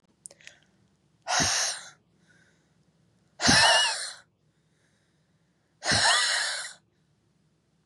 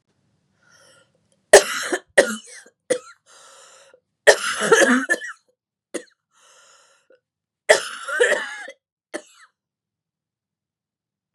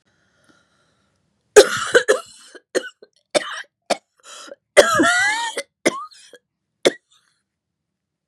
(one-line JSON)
{"exhalation_length": "7.9 s", "exhalation_amplitude": 18171, "exhalation_signal_mean_std_ratio": 0.4, "three_cough_length": "11.3 s", "three_cough_amplitude": 32768, "three_cough_signal_mean_std_ratio": 0.28, "cough_length": "8.3 s", "cough_amplitude": 32768, "cough_signal_mean_std_ratio": 0.31, "survey_phase": "beta (2021-08-13 to 2022-03-07)", "age": "18-44", "gender": "Female", "wearing_mask": "No", "symptom_cough_any": true, "symptom_new_continuous_cough": true, "symptom_runny_or_blocked_nose": true, "symptom_sore_throat": true, "symptom_diarrhoea": true, "symptom_fatigue": true, "symptom_headache": true, "symptom_onset": "2 days", "smoker_status": "Never smoked", "respiratory_condition_asthma": false, "respiratory_condition_other": false, "recruitment_source": "Test and Trace", "submission_delay": "2 days", "covid_test_result": "Positive", "covid_test_method": "RT-qPCR", "covid_ct_value": 21.0, "covid_ct_gene": "ORF1ab gene"}